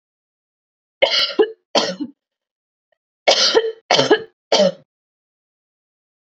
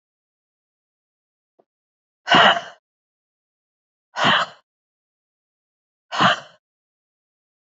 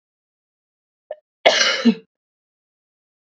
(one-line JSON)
{"three_cough_length": "6.4 s", "three_cough_amplitude": 32768, "three_cough_signal_mean_std_ratio": 0.38, "exhalation_length": "7.7 s", "exhalation_amplitude": 27063, "exhalation_signal_mean_std_ratio": 0.25, "cough_length": "3.3 s", "cough_amplitude": 30547, "cough_signal_mean_std_ratio": 0.28, "survey_phase": "beta (2021-08-13 to 2022-03-07)", "age": "18-44", "gender": "Female", "wearing_mask": "No", "symptom_cough_any": true, "symptom_runny_or_blocked_nose": true, "symptom_shortness_of_breath": true, "symptom_sore_throat": true, "symptom_fatigue": true, "symptom_fever_high_temperature": true, "symptom_onset": "4 days", "smoker_status": "Never smoked", "respiratory_condition_asthma": false, "respiratory_condition_other": false, "recruitment_source": "Test and Trace", "submission_delay": "2 days", "covid_test_result": "Positive", "covid_test_method": "RT-qPCR", "covid_ct_value": 19.6, "covid_ct_gene": "ORF1ab gene", "covid_ct_mean": 19.9, "covid_viral_load": "300000 copies/ml", "covid_viral_load_category": "Low viral load (10K-1M copies/ml)"}